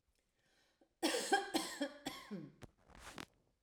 {
  "cough_length": "3.6 s",
  "cough_amplitude": 3433,
  "cough_signal_mean_std_ratio": 0.42,
  "survey_phase": "alpha (2021-03-01 to 2021-08-12)",
  "age": "45-64",
  "gender": "Female",
  "wearing_mask": "No",
  "symptom_none": true,
  "smoker_status": "Never smoked",
  "respiratory_condition_asthma": true,
  "respiratory_condition_other": false,
  "recruitment_source": "REACT",
  "submission_delay": "2 days",
  "covid_test_result": "Negative",
  "covid_test_method": "RT-qPCR"
}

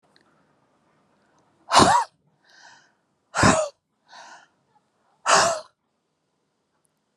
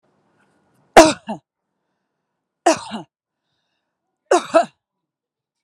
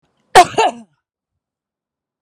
{
  "exhalation_length": "7.2 s",
  "exhalation_amplitude": 29572,
  "exhalation_signal_mean_std_ratio": 0.29,
  "three_cough_length": "5.6 s",
  "three_cough_amplitude": 32768,
  "three_cough_signal_mean_std_ratio": 0.22,
  "cough_length": "2.2 s",
  "cough_amplitude": 32768,
  "cough_signal_mean_std_ratio": 0.25,
  "survey_phase": "alpha (2021-03-01 to 2021-08-12)",
  "age": "45-64",
  "gender": "Female",
  "wearing_mask": "No",
  "symptom_fatigue": true,
  "symptom_headache": true,
  "smoker_status": "Never smoked",
  "respiratory_condition_asthma": false,
  "respiratory_condition_other": false,
  "recruitment_source": "Test and Trace",
  "submission_delay": "2 days",
  "covid_test_result": "Positive",
  "covid_test_method": "RT-qPCR"
}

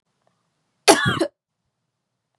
{
  "cough_length": "2.4 s",
  "cough_amplitude": 32768,
  "cough_signal_mean_std_ratio": 0.27,
  "survey_phase": "beta (2021-08-13 to 2022-03-07)",
  "age": "18-44",
  "gender": "Female",
  "wearing_mask": "No",
  "symptom_cough_any": true,
  "symptom_runny_or_blocked_nose": true,
  "symptom_sore_throat": true,
  "symptom_headache": true,
  "symptom_other": true,
  "symptom_onset": "4 days",
  "smoker_status": "Never smoked",
  "respiratory_condition_asthma": false,
  "respiratory_condition_other": false,
  "recruitment_source": "Test and Trace",
  "submission_delay": "2 days",
  "covid_test_result": "Positive",
  "covid_test_method": "ePCR"
}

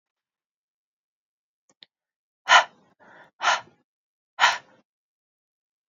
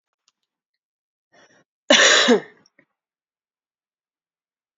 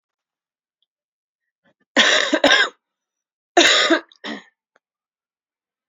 {
  "exhalation_length": "5.9 s",
  "exhalation_amplitude": 24051,
  "exhalation_signal_mean_std_ratio": 0.21,
  "cough_length": "4.8 s",
  "cough_amplitude": 28989,
  "cough_signal_mean_std_ratio": 0.26,
  "three_cough_length": "5.9 s",
  "three_cough_amplitude": 30116,
  "three_cough_signal_mean_std_ratio": 0.34,
  "survey_phase": "beta (2021-08-13 to 2022-03-07)",
  "age": "18-44",
  "gender": "Female",
  "wearing_mask": "No",
  "symptom_cough_any": true,
  "symptom_runny_or_blocked_nose": true,
  "symptom_shortness_of_breath": true,
  "symptom_sore_throat": true,
  "symptom_fatigue": true,
  "symptom_headache": true,
  "symptom_change_to_sense_of_smell_or_taste": true,
  "symptom_loss_of_taste": true,
  "symptom_onset": "4 days",
  "smoker_status": "Never smoked",
  "respiratory_condition_asthma": true,
  "respiratory_condition_other": false,
  "recruitment_source": "Test and Trace",
  "submission_delay": "2 days",
  "covid_test_result": "Positive",
  "covid_test_method": "RT-qPCR",
  "covid_ct_value": 21.0,
  "covid_ct_gene": "N gene",
  "covid_ct_mean": 21.6,
  "covid_viral_load": "82000 copies/ml",
  "covid_viral_load_category": "Low viral load (10K-1M copies/ml)"
}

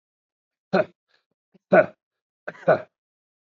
{
  "three_cough_length": "3.6 s",
  "three_cough_amplitude": 24779,
  "three_cough_signal_mean_std_ratio": 0.24,
  "survey_phase": "beta (2021-08-13 to 2022-03-07)",
  "age": "45-64",
  "gender": "Male",
  "wearing_mask": "No",
  "symptom_none": true,
  "smoker_status": "Never smoked",
  "respiratory_condition_asthma": false,
  "respiratory_condition_other": false,
  "recruitment_source": "REACT",
  "submission_delay": "2 days",
  "covid_test_result": "Negative",
  "covid_test_method": "RT-qPCR",
  "influenza_a_test_result": "Negative",
  "influenza_b_test_result": "Negative"
}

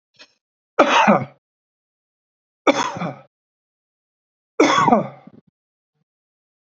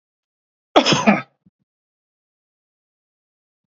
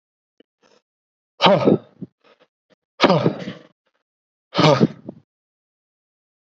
{
  "three_cough_length": "6.7 s",
  "three_cough_amplitude": 31418,
  "three_cough_signal_mean_std_ratio": 0.33,
  "cough_length": "3.7 s",
  "cough_amplitude": 27631,
  "cough_signal_mean_std_ratio": 0.24,
  "exhalation_length": "6.6 s",
  "exhalation_amplitude": 29490,
  "exhalation_signal_mean_std_ratio": 0.31,
  "survey_phase": "beta (2021-08-13 to 2022-03-07)",
  "age": "45-64",
  "gender": "Male",
  "wearing_mask": "No",
  "symptom_none": true,
  "smoker_status": "Never smoked",
  "respiratory_condition_asthma": false,
  "respiratory_condition_other": false,
  "recruitment_source": "REACT",
  "submission_delay": "1 day",
  "covid_test_result": "Negative",
  "covid_test_method": "RT-qPCR",
  "influenza_a_test_result": "Negative",
  "influenza_b_test_result": "Negative"
}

